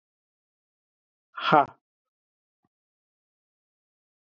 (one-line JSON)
{"exhalation_length": "4.4 s", "exhalation_amplitude": 20287, "exhalation_signal_mean_std_ratio": 0.16, "survey_phase": "beta (2021-08-13 to 2022-03-07)", "age": "45-64", "gender": "Male", "wearing_mask": "No", "symptom_cough_any": true, "symptom_runny_or_blocked_nose": true, "smoker_status": "Never smoked", "respiratory_condition_asthma": false, "respiratory_condition_other": false, "recruitment_source": "Test and Trace", "submission_delay": "2 days", "covid_test_result": "Positive", "covid_test_method": "RT-qPCR", "covid_ct_value": 33.4, "covid_ct_gene": "ORF1ab gene"}